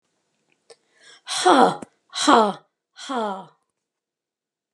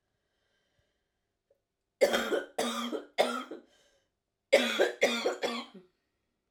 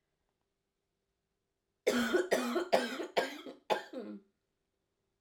{"exhalation_length": "4.7 s", "exhalation_amplitude": 32767, "exhalation_signal_mean_std_ratio": 0.33, "three_cough_length": "6.5 s", "three_cough_amplitude": 12531, "three_cough_signal_mean_std_ratio": 0.41, "cough_length": "5.2 s", "cough_amplitude": 7277, "cough_signal_mean_std_ratio": 0.42, "survey_phase": "alpha (2021-03-01 to 2021-08-12)", "age": "18-44", "gender": "Female", "wearing_mask": "No", "symptom_new_continuous_cough": true, "symptom_shortness_of_breath": true, "symptom_fatigue": true, "symptom_fever_high_temperature": true, "symptom_headache": true, "symptom_onset": "4 days", "smoker_status": "Ex-smoker", "respiratory_condition_asthma": false, "respiratory_condition_other": false, "recruitment_source": "Test and Trace", "submission_delay": "1 day", "covid_test_result": "Positive", "covid_test_method": "RT-qPCR", "covid_ct_value": 14.7, "covid_ct_gene": "ORF1ab gene", "covid_ct_mean": 15.2, "covid_viral_load": "10000000 copies/ml", "covid_viral_load_category": "High viral load (>1M copies/ml)"}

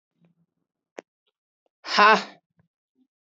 {"exhalation_length": "3.3 s", "exhalation_amplitude": 22650, "exhalation_signal_mean_std_ratio": 0.22, "survey_phase": "beta (2021-08-13 to 2022-03-07)", "age": "18-44", "gender": "Female", "wearing_mask": "No", "symptom_cough_any": true, "symptom_runny_or_blocked_nose": true, "symptom_sore_throat": true, "symptom_fatigue": true, "symptom_headache": true, "smoker_status": "Never smoked", "respiratory_condition_asthma": false, "respiratory_condition_other": false, "recruitment_source": "Test and Trace", "submission_delay": "2 days", "covid_test_result": "Positive", "covid_test_method": "RT-qPCR"}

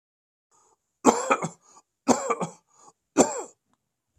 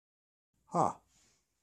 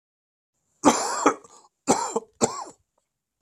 {"three_cough_length": "4.2 s", "three_cough_amplitude": 32767, "three_cough_signal_mean_std_ratio": 0.31, "exhalation_length": "1.6 s", "exhalation_amplitude": 5669, "exhalation_signal_mean_std_ratio": 0.25, "cough_length": "3.4 s", "cough_amplitude": 30011, "cough_signal_mean_std_ratio": 0.36, "survey_phase": "beta (2021-08-13 to 2022-03-07)", "age": "65+", "gender": "Male", "wearing_mask": "No", "symptom_cough_any": true, "smoker_status": "Ex-smoker", "respiratory_condition_asthma": false, "respiratory_condition_other": false, "recruitment_source": "REACT", "submission_delay": "32 days", "covid_test_result": "Negative", "covid_test_method": "RT-qPCR", "influenza_a_test_result": "Unknown/Void", "influenza_b_test_result": "Unknown/Void"}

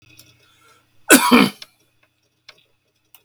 {"cough_length": "3.2 s", "cough_amplitude": 32768, "cough_signal_mean_std_ratio": 0.27, "survey_phase": "beta (2021-08-13 to 2022-03-07)", "age": "65+", "gender": "Male", "wearing_mask": "No", "symptom_cough_any": true, "smoker_status": "Ex-smoker", "respiratory_condition_asthma": true, "respiratory_condition_other": false, "recruitment_source": "REACT", "submission_delay": "1 day", "covid_test_result": "Negative", "covid_test_method": "RT-qPCR"}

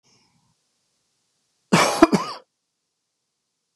{"cough_length": "3.8 s", "cough_amplitude": 32768, "cough_signal_mean_std_ratio": 0.24, "survey_phase": "beta (2021-08-13 to 2022-03-07)", "age": "45-64", "gender": "Male", "wearing_mask": "No", "symptom_none": true, "smoker_status": "Never smoked", "respiratory_condition_asthma": false, "respiratory_condition_other": false, "recruitment_source": "REACT", "submission_delay": "1 day", "covid_test_result": "Negative", "covid_test_method": "RT-qPCR"}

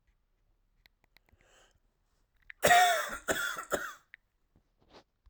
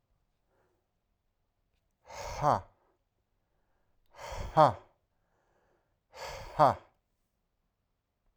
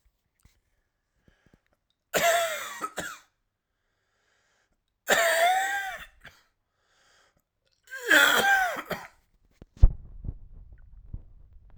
{"cough_length": "5.3 s", "cough_amplitude": 8944, "cough_signal_mean_std_ratio": 0.31, "exhalation_length": "8.4 s", "exhalation_amplitude": 12485, "exhalation_signal_mean_std_ratio": 0.22, "three_cough_length": "11.8 s", "three_cough_amplitude": 19139, "three_cough_signal_mean_std_ratio": 0.36, "survey_phase": "alpha (2021-03-01 to 2021-08-12)", "age": "18-44", "gender": "Male", "wearing_mask": "No", "symptom_cough_any": true, "symptom_shortness_of_breath": true, "symptom_fatigue": true, "symptom_change_to_sense_of_smell_or_taste": true, "symptom_loss_of_taste": true, "symptom_onset": "4 days", "smoker_status": "Ex-smoker", "respiratory_condition_asthma": false, "respiratory_condition_other": false, "recruitment_source": "Test and Trace", "submission_delay": "2 days", "covid_test_result": "Positive", "covid_test_method": "RT-qPCR"}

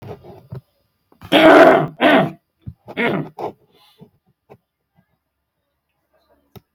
{"cough_length": "6.7 s", "cough_amplitude": 32768, "cough_signal_mean_std_ratio": 0.33, "survey_phase": "beta (2021-08-13 to 2022-03-07)", "age": "65+", "gender": "Male", "wearing_mask": "No", "symptom_abdominal_pain": true, "smoker_status": "Ex-smoker", "respiratory_condition_asthma": false, "respiratory_condition_other": false, "recruitment_source": "REACT", "submission_delay": "8 days", "covid_test_result": "Negative", "covid_test_method": "RT-qPCR", "influenza_a_test_result": "Negative", "influenza_b_test_result": "Negative"}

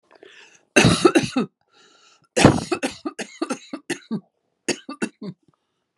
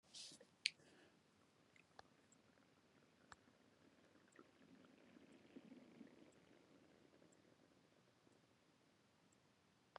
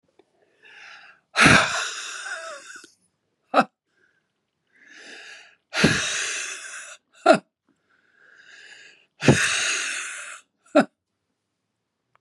{"cough_length": "6.0 s", "cough_amplitude": 32768, "cough_signal_mean_std_ratio": 0.35, "three_cough_length": "10.0 s", "three_cough_amplitude": 4345, "three_cough_signal_mean_std_ratio": 0.32, "exhalation_length": "12.2 s", "exhalation_amplitude": 29517, "exhalation_signal_mean_std_ratio": 0.34, "survey_phase": "beta (2021-08-13 to 2022-03-07)", "age": "45-64", "gender": "Female", "wearing_mask": "No", "symptom_cough_any": true, "symptom_new_continuous_cough": true, "symptom_runny_or_blocked_nose": true, "symptom_shortness_of_breath": true, "symptom_fatigue": true, "symptom_fever_high_temperature": true, "symptom_headache": true, "symptom_change_to_sense_of_smell_or_taste": true, "symptom_loss_of_taste": true, "symptom_onset": "3 days", "smoker_status": "Ex-smoker", "respiratory_condition_asthma": false, "respiratory_condition_other": false, "recruitment_source": "Test and Trace", "submission_delay": "1 day", "covid_test_result": "Positive", "covid_test_method": "RT-qPCR", "covid_ct_value": 20.5, "covid_ct_gene": "ORF1ab gene", "covid_ct_mean": 21.1, "covid_viral_load": "120000 copies/ml", "covid_viral_load_category": "Low viral load (10K-1M copies/ml)"}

